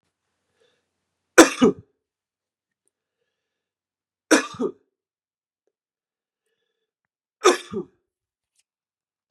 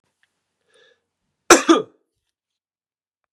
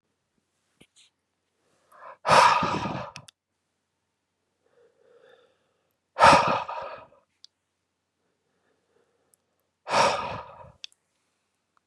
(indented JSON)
{
  "three_cough_length": "9.3 s",
  "three_cough_amplitude": 32768,
  "three_cough_signal_mean_std_ratio": 0.18,
  "cough_length": "3.3 s",
  "cough_amplitude": 32768,
  "cough_signal_mean_std_ratio": 0.2,
  "exhalation_length": "11.9 s",
  "exhalation_amplitude": 23013,
  "exhalation_signal_mean_std_ratio": 0.27,
  "survey_phase": "beta (2021-08-13 to 2022-03-07)",
  "age": "18-44",
  "gender": "Male",
  "wearing_mask": "No",
  "symptom_none": true,
  "smoker_status": "Never smoked",
  "respiratory_condition_asthma": false,
  "respiratory_condition_other": false,
  "recruitment_source": "REACT",
  "submission_delay": "2 days",
  "covid_test_result": "Negative",
  "covid_test_method": "RT-qPCR",
  "influenza_a_test_result": "Negative",
  "influenza_b_test_result": "Negative"
}